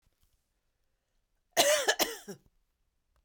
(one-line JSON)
{"cough_length": "3.2 s", "cough_amplitude": 11822, "cough_signal_mean_std_ratio": 0.31, "survey_phase": "beta (2021-08-13 to 2022-03-07)", "age": "45-64", "gender": "Female", "wearing_mask": "No", "symptom_none": true, "smoker_status": "Never smoked", "respiratory_condition_asthma": false, "respiratory_condition_other": false, "recruitment_source": "REACT", "submission_delay": "3 days", "covid_test_result": "Negative", "covid_test_method": "RT-qPCR"}